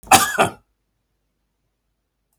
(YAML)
cough_length: 2.4 s
cough_amplitude: 32768
cough_signal_mean_std_ratio: 0.26
survey_phase: beta (2021-08-13 to 2022-03-07)
age: 65+
gender: Male
wearing_mask: 'No'
symptom_change_to_sense_of_smell_or_taste: true
smoker_status: Never smoked
respiratory_condition_asthma: false
respiratory_condition_other: false
recruitment_source: Test and Trace
submission_delay: 1 day
covid_test_result: Positive
covid_test_method: LFT